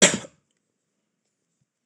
cough_length: 1.9 s
cough_amplitude: 26027
cough_signal_mean_std_ratio: 0.2
survey_phase: beta (2021-08-13 to 2022-03-07)
age: 65+
gender: Male
wearing_mask: 'No'
symptom_runny_or_blocked_nose: true
symptom_sore_throat: true
smoker_status: Never smoked
respiratory_condition_asthma: false
respiratory_condition_other: false
recruitment_source: Test and Trace
submission_delay: 1 day
covid_test_result: Negative
covid_test_method: RT-qPCR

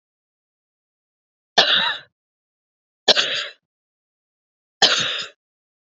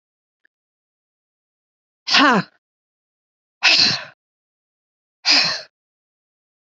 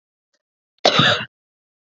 three_cough_length: 6.0 s
three_cough_amplitude: 31267
three_cough_signal_mean_std_ratio: 0.31
exhalation_length: 6.7 s
exhalation_amplitude: 31948
exhalation_signal_mean_std_ratio: 0.31
cough_length: 2.0 s
cough_amplitude: 30268
cough_signal_mean_std_ratio: 0.33
survey_phase: beta (2021-08-13 to 2022-03-07)
age: 45-64
gender: Female
wearing_mask: 'No'
symptom_none: true
symptom_onset: 12 days
smoker_status: Never smoked
respiratory_condition_asthma: false
respiratory_condition_other: false
recruitment_source: REACT
submission_delay: 1 day
covid_test_result: Negative
covid_test_method: RT-qPCR
influenza_a_test_result: Negative
influenza_b_test_result: Negative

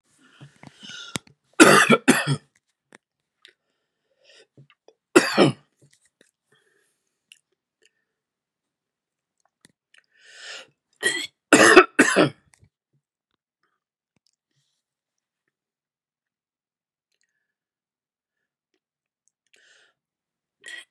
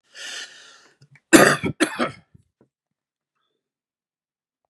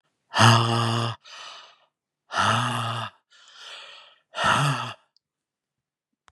three_cough_length: 20.9 s
three_cough_amplitude: 32767
three_cough_signal_mean_std_ratio: 0.21
cough_length: 4.7 s
cough_amplitude: 32768
cough_signal_mean_std_ratio: 0.25
exhalation_length: 6.3 s
exhalation_amplitude: 29785
exhalation_signal_mean_std_ratio: 0.46
survey_phase: beta (2021-08-13 to 2022-03-07)
age: 45-64
gender: Male
wearing_mask: 'No'
symptom_none: true
smoker_status: Ex-smoker
respiratory_condition_asthma: false
respiratory_condition_other: false
recruitment_source: REACT
submission_delay: 2 days
covid_test_result: Negative
covid_test_method: RT-qPCR
influenza_a_test_result: Negative
influenza_b_test_result: Negative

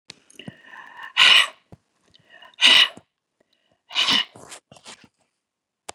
exhalation_length: 5.9 s
exhalation_amplitude: 28639
exhalation_signal_mean_std_ratio: 0.3
survey_phase: beta (2021-08-13 to 2022-03-07)
age: 65+
gender: Female
wearing_mask: 'No'
symptom_none: true
smoker_status: Never smoked
respiratory_condition_asthma: false
respiratory_condition_other: false
recruitment_source: REACT
submission_delay: 3 days
covid_test_result: Negative
covid_test_method: RT-qPCR
influenza_a_test_result: Negative
influenza_b_test_result: Negative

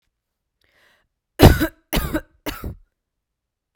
three_cough_length: 3.8 s
three_cough_amplitude: 32768
three_cough_signal_mean_std_ratio: 0.25
survey_phase: alpha (2021-03-01 to 2021-08-12)
age: 18-44
gender: Female
wearing_mask: 'No'
symptom_cough_any: true
symptom_fatigue: true
symptom_onset: 3 days
smoker_status: Ex-smoker
respiratory_condition_asthma: false
respiratory_condition_other: false
recruitment_source: Test and Trace
submission_delay: 2 days
covid_test_result: Positive
covid_test_method: RT-qPCR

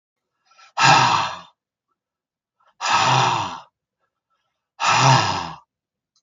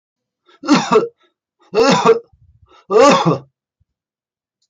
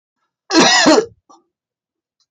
exhalation_length: 6.2 s
exhalation_amplitude: 27954
exhalation_signal_mean_std_ratio: 0.45
three_cough_length: 4.7 s
three_cough_amplitude: 28124
three_cough_signal_mean_std_ratio: 0.43
cough_length: 2.3 s
cough_amplitude: 29286
cough_signal_mean_std_ratio: 0.41
survey_phase: alpha (2021-03-01 to 2021-08-12)
age: 65+
gender: Male
wearing_mask: 'No'
symptom_fatigue: true
smoker_status: Never smoked
respiratory_condition_asthma: false
respiratory_condition_other: false
recruitment_source: REACT
submission_delay: 1 day
covid_test_result: Negative
covid_test_method: RT-qPCR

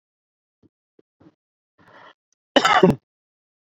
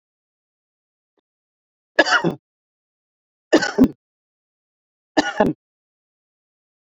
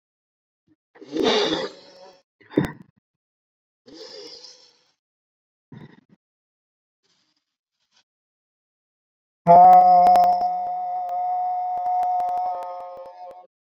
cough_length: 3.7 s
cough_amplitude: 27350
cough_signal_mean_std_ratio: 0.23
three_cough_length: 7.0 s
three_cough_amplitude: 30027
three_cough_signal_mean_std_ratio: 0.25
exhalation_length: 13.7 s
exhalation_amplitude: 21770
exhalation_signal_mean_std_ratio: 0.41
survey_phase: beta (2021-08-13 to 2022-03-07)
age: 18-44
gender: Male
wearing_mask: 'Yes'
symptom_none: true
smoker_status: Never smoked
respiratory_condition_asthma: false
respiratory_condition_other: false
recruitment_source: REACT
submission_delay: 1 day
covid_test_result: Negative
covid_test_method: RT-qPCR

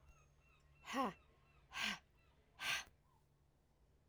exhalation_length: 4.1 s
exhalation_amplitude: 1389
exhalation_signal_mean_std_ratio: 0.38
survey_phase: alpha (2021-03-01 to 2021-08-12)
age: 45-64
gender: Female
wearing_mask: 'No'
symptom_cough_any: true
symptom_change_to_sense_of_smell_or_taste: true
symptom_onset: 3 days
smoker_status: Never smoked
respiratory_condition_asthma: false
respiratory_condition_other: false
recruitment_source: Test and Trace
submission_delay: 1 day
covid_test_result: Positive
covid_test_method: RT-qPCR
covid_ct_value: 23.8
covid_ct_gene: ORF1ab gene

